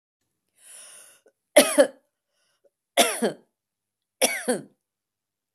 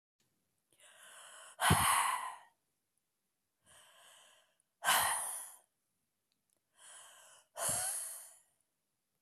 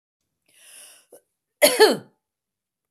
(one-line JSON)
{"three_cough_length": "5.5 s", "three_cough_amplitude": 29290, "three_cough_signal_mean_std_ratio": 0.27, "exhalation_length": "9.2 s", "exhalation_amplitude": 5474, "exhalation_signal_mean_std_ratio": 0.36, "cough_length": "2.9 s", "cough_amplitude": 25695, "cough_signal_mean_std_ratio": 0.26, "survey_phase": "beta (2021-08-13 to 2022-03-07)", "age": "65+", "gender": "Female", "wearing_mask": "No", "symptom_none": true, "smoker_status": "Ex-smoker", "respiratory_condition_asthma": false, "respiratory_condition_other": false, "recruitment_source": "REACT", "submission_delay": "7 days", "covid_test_result": "Negative", "covid_test_method": "RT-qPCR", "influenza_a_test_result": "Negative", "influenza_b_test_result": "Negative"}